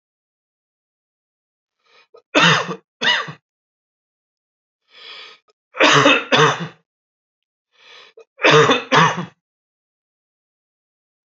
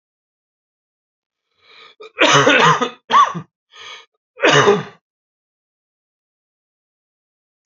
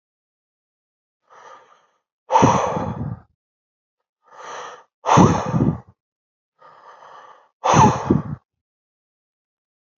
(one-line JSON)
{"three_cough_length": "11.3 s", "three_cough_amplitude": 30228, "three_cough_signal_mean_std_ratio": 0.33, "cough_length": "7.7 s", "cough_amplitude": 30933, "cough_signal_mean_std_ratio": 0.34, "exhalation_length": "10.0 s", "exhalation_amplitude": 30115, "exhalation_signal_mean_std_ratio": 0.34, "survey_phase": "alpha (2021-03-01 to 2021-08-12)", "age": "18-44", "gender": "Male", "wearing_mask": "No", "symptom_cough_any": true, "symptom_fatigue": true, "symptom_fever_high_temperature": true, "symptom_headache": true, "smoker_status": "Never smoked", "respiratory_condition_asthma": false, "respiratory_condition_other": false, "recruitment_source": "Test and Trace", "submission_delay": "1 day", "covid_test_result": "Positive", "covid_test_method": "RT-qPCR", "covid_ct_value": 18.3, "covid_ct_gene": "ORF1ab gene", "covid_ct_mean": 18.7, "covid_viral_load": "760000 copies/ml", "covid_viral_load_category": "Low viral load (10K-1M copies/ml)"}